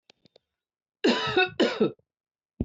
{"cough_length": "2.6 s", "cough_amplitude": 10039, "cough_signal_mean_std_ratio": 0.42, "survey_phase": "beta (2021-08-13 to 2022-03-07)", "age": "45-64", "gender": "Female", "wearing_mask": "No", "symptom_none": true, "smoker_status": "Ex-smoker", "respiratory_condition_asthma": false, "respiratory_condition_other": false, "recruitment_source": "REACT", "submission_delay": "1 day", "covid_test_result": "Negative", "covid_test_method": "RT-qPCR", "influenza_a_test_result": "Unknown/Void", "influenza_b_test_result": "Unknown/Void"}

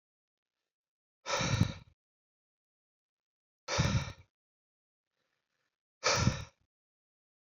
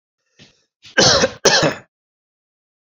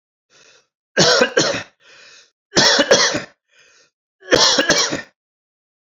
{"exhalation_length": "7.4 s", "exhalation_amplitude": 6460, "exhalation_signal_mean_std_ratio": 0.31, "cough_length": "2.8 s", "cough_amplitude": 31837, "cough_signal_mean_std_ratio": 0.38, "three_cough_length": "5.8 s", "three_cough_amplitude": 32768, "three_cough_signal_mean_std_ratio": 0.46, "survey_phase": "alpha (2021-03-01 to 2021-08-12)", "age": "18-44", "gender": "Male", "wearing_mask": "No", "symptom_none": true, "smoker_status": "Never smoked", "respiratory_condition_asthma": false, "respiratory_condition_other": false, "recruitment_source": "Test and Trace", "submission_delay": "2 days", "covid_test_result": "Positive", "covid_test_method": "RT-qPCR"}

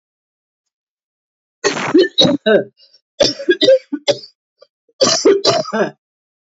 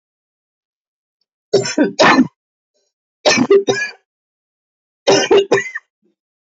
{"cough_length": "6.5 s", "cough_amplitude": 31370, "cough_signal_mean_std_ratio": 0.45, "three_cough_length": "6.5 s", "three_cough_amplitude": 32664, "three_cough_signal_mean_std_ratio": 0.4, "survey_phase": "alpha (2021-03-01 to 2021-08-12)", "age": "45-64", "gender": "Female", "wearing_mask": "No", "symptom_cough_any": true, "symptom_fatigue": true, "symptom_fever_high_temperature": true, "symptom_headache": true, "symptom_change_to_sense_of_smell_or_taste": true, "symptom_loss_of_taste": true, "symptom_onset": "5 days", "smoker_status": "Ex-smoker", "respiratory_condition_asthma": true, "respiratory_condition_other": false, "recruitment_source": "Test and Trace", "submission_delay": "2 days", "covid_test_result": "Positive", "covid_test_method": "RT-qPCR", "covid_ct_value": 15.6, "covid_ct_gene": "N gene", "covid_ct_mean": 15.8, "covid_viral_load": "6500000 copies/ml", "covid_viral_load_category": "High viral load (>1M copies/ml)"}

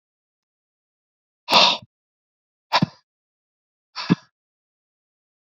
{"exhalation_length": "5.5 s", "exhalation_amplitude": 29374, "exhalation_signal_mean_std_ratio": 0.22, "survey_phase": "beta (2021-08-13 to 2022-03-07)", "age": "18-44", "gender": "Male", "wearing_mask": "No", "symptom_cough_any": true, "symptom_runny_or_blocked_nose": true, "symptom_fatigue": true, "symptom_fever_high_temperature": true, "symptom_headache": true, "symptom_change_to_sense_of_smell_or_taste": true, "smoker_status": "Never smoked", "respiratory_condition_asthma": true, "respiratory_condition_other": false, "recruitment_source": "Test and Trace", "submission_delay": "2 days", "covid_test_result": "Positive", "covid_test_method": "RT-qPCR", "covid_ct_value": 28.2, "covid_ct_gene": "ORF1ab gene", "covid_ct_mean": 28.7, "covid_viral_load": "400 copies/ml", "covid_viral_load_category": "Minimal viral load (< 10K copies/ml)"}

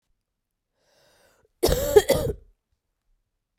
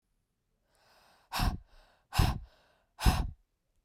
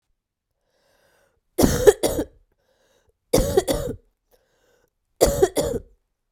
{"cough_length": "3.6 s", "cough_amplitude": 25576, "cough_signal_mean_std_ratio": 0.28, "exhalation_length": "3.8 s", "exhalation_amplitude": 8675, "exhalation_signal_mean_std_ratio": 0.33, "three_cough_length": "6.3 s", "three_cough_amplitude": 32768, "three_cough_signal_mean_std_ratio": 0.34, "survey_phase": "beta (2021-08-13 to 2022-03-07)", "age": "18-44", "gender": "Female", "wearing_mask": "No", "symptom_cough_any": true, "symptom_new_continuous_cough": true, "symptom_runny_or_blocked_nose": true, "symptom_sore_throat": true, "symptom_fatigue": true, "symptom_onset": "3 days", "smoker_status": "Never smoked", "respiratory_condition_asthma": false, "respiratory_condition_other": false, "recruitment_source": "Test and Trace", "submission_delay": "2 days", "covid_test_result": "Positive", "covid_test_method": "ePCR"}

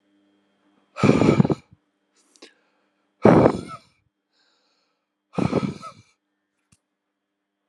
{"exhalation_length": "7.7 s", "exhalation_amplitude": 32758, "exhalation_signal_mean_std_ratio": 0.28, "survey_phase": "alpha (2021-03-01 to 2021-08-12)", "age": "18-44", "gender": "Male", "wearing_mask": "No", "symptom_abdominal_pain": true, "symptom_fatigue": true, "symptom_headache": true, "symptom_change_to_sense_of_smell_or_taste": true, "symptom_loss_of_taste": true, "symptom_onset": "4 days", "smoker_status": "Current smoker (e-cigarettes or vapes only)", "respiratory_condition_asthma": false, "respiratory_condition_other": false, "recruitment_source": "Test and Trace", "submission_delay": "2 days", "covid_test_result": "Positive", "covid_test_method": "RT-qPCR", "covid_ct_value": 17.1, "covid_ct_gene": "N gene", "covid_ct_mean": 17.8, "covid_viral_load": "1400000 copies/ml", "covid_viral_load_category": "High viral load (>1M copies/ml)"}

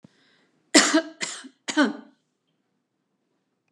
{"cough_length": "3.7 s", "cough_amplitude": 32767, "cough_signal_mean_std_ratio": 0.29, "survey_phase": "beta (2021-08-13 to 2022-03-07)", "age": "65+", "gender": "Female", "wearing_mask": "No", "symptom_none": true, "smoker_status": "Never smoked", "respiratory_condition_asthma": false, "respiratory_condition_other": false, "recruitment_source": "REACT", "submission_delay": "1 day", "covid_test_result": "Negative", "covid_test_method": "RT-qPCR", "influenza_a_test_result": "Negative", "influenza_b_test_result": "Negative"}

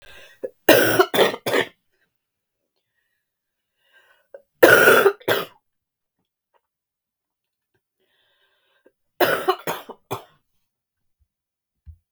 {"three_cough_length": "12.1 s", "three_cough_amplitude": 32768, "three_cough_signal_mean_std_ratio": 0.29, "survey_phase": "beta (2021-08-13 to 2022-03-07)", "age": "45-64", "gender": "Female", "wearing_mask": "No", "symptom_cough_any": true, "symptom_runny_or_blocked_nose": true, "symptom_fatigue": true, "symptom_headache": true, "symptom_onset": "3 days", "smoker_status": "Ex-smoker", "respiratory_condition_asthma": false, "respiratory_condition_other": false, "recruitment_source": "Test and Trace", "submission_delay": "1 day", "covid_test_result": "Positive", "covid_test_method": "RT-qPCR", "covid_ct_value": 19.6, "covid_ct_gene": "ORF1ab gene"}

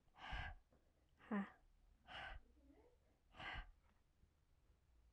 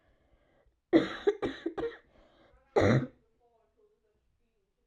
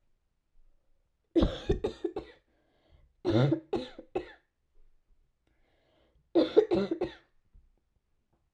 {"exhalation_length": "5.1 s", "exhalation_amplitude": 583, "exhalation_signal_mean_std_ratio": 0.44, "cough_length": "4.9 s", "cough_amplitude": 10807, "cough_signal_mean_std_ratio": 0.32, "three_cough_length": "8.5 s", "three_cough_amplitude": 12014, "three_cough_signal_mean_std_ratio": 0.33, "survey_phase": "alpha (2021-03-01 to 2021-08-12)", "age": "18-44", "gender": "Female", "wearing_mask": "No", "symptom_cough_any": true, "symptom_shortness_of_breath": true, "symptom_fatigue": true, "symptom_fever_high_temperature": true, "symptom_headache": true, "symptom_change_to_sense_of_smell_or_taste": true, "symptom_loss_of_taste": true, "symptom_onset": "2 days", "smoker_status": "Never smoked", "respiratory_condition_asthma": false, "respiratory_condition_other": false, "recruitment_source": "Test and Trace", "submission_delay": "1 day", "covid_test_result": "Positive", "covid_test_method": "RT-qPCR"}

